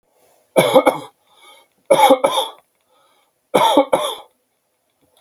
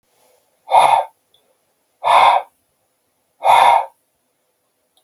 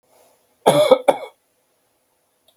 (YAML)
three_cough_length: 5.2 s
three_cough_amplitude: 32768
three_cough_signal_mean_std_ratio: 0.4
exhalation_length: 5.0 s
exhalation_amplitude: 32768
exhalation_signal_mean_std_ratio: 0.39
cough_length: 2.6 s
cough_amplitude: 32768
cough_signal_mean_std_ratio: 0.3
survey_phase: beta (2021-08-13 to 2022-03-07)
age: 45-64
gender: Male
wearing_mask: 'No'
symptom_none: true
smoker_status: Never smoked
respiratory_condition_asthma: false
respiratory_condition_other: false
recruitment_source: REACT
submission_delay: 4 days
covid_test_result: Negative
covid_test_method: RT-qPCR
influenza_a_test_result: Negative
influenza_b_test_result: Negative